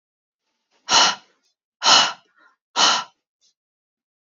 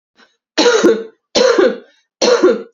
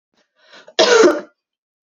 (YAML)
exhalation_length: 4.4 s
exhalation_amplitude: 30021
exhalation_signal_mean_std_ratio: 0.33
three_cough_length: 2.7 s
three_cough_amplitude: 30594
three_cough_signal_mean_std_ratio: 0.6
cough_length: 1.9 s
cough_amplitude: 30249
cough_signal_mean_std_ratio: 0.39
survey_phase: beta (2021-08-13 to 2022-03-07)
age: 18-44
gender: Female
wearing_mask: 'No'
symptom_none: true
smoker_status: Never smoked
respiratory_condition_asthma: false
respiratory_condition_other: false
recruitment_source: REACT
submission_delay: 2 days
covid_test_result: Negative
covid_test_method: RT-qPCR
influenza_a_test_result: Unknown/Void
influenza_b_test_result: Unknown/Void